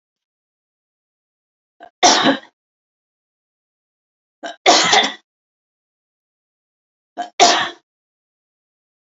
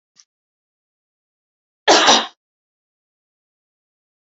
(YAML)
three_cough_length: 9.1 s
three_cough_amplitude: 29887
three_cough_signal_mean_std_ratio: 0.27
cough_length: 4.3 s
cough_amplitude: 32768
cough_signal_mean_std_ratio: 0.23
survey_phase: beta (2021-08-13 to 2022-03-07)
age: 45-64
gender: Female
wearing_mask: 'No'
symptom_none: true
smoker_status: Never smoked
respiratory_condition_asthma: false
respiratory_condition_other: false
recruitment_source: REACT
submission_delay: 1 day
covid_test_result: Negative
covid_test_method: RT-qPCR
influenza_a_test_result: Negative
influenza_b_test_result: Negative